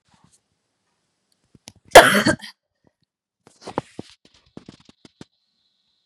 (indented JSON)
{
  "cough_length": "6.1 s",
  "cough_amplitude": 32768,
  "cough_signal_mean_std_ratio": 0.17,
  "survey_phase": "beta (2021-08-13 to 2022-03-07)",
  "age": "18-44",
  "gender": "Female",
  "wearing_mask": "No",
  "symptom_none": true,
  "smoker_status": "Never smoked",
  "respiratory_condition_asthma": true,
  "respiratory_condition_other": false,
  "recruitment_source": "REACT",
  "submission_delay": "5 days",
  "covid_test_result": "Negative",
  "covid_test_method": "RT-qPCR",
  "influenza_a_test_result": "Negative",
  "influenza_b_test_result": "Negative"
}